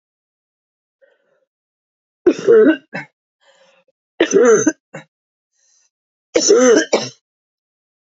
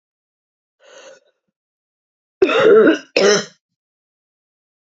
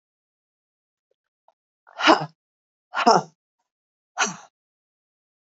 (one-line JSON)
{"three_cough_length": "8.0 s", "three_cough_amplitude": 29493, "three_cough_signal_mean_std_ratio": 0.36, "cough_length": "4.9 s", "cough_amplitude": 31237, "cough_signal_mean_std_ratio": 0.34, "exhalation_length": "5.5 s", "exhalation_amplitude": 27367, "exhalation_signal_mean_std_ratio": 0.23, "survey_phase": "beta (2021-08-13 to 2022-03-07)", "age": "45-64", "gender": "Female", "wearing_mask": "No", "symptom_cough_any": true, "symptom_runny_or_blocked_nose": true, "symptom_sore_throat": true, "symptom_fatigue": true, "symptom_fever_high_temperature": true, "symptom_headache": true, "symptom_change_to_sense_of_smell_or_taste": true, "symptom_other": true, "smoker_status": "Never smoked", "respiratory_condition_asthma": false, "respiratory_condition_other": false, "recruitment_source": "Test and Trace", "submission_delay": "2 days", "covid_test_result": "Positive", "covid_test_method": "ePCR"}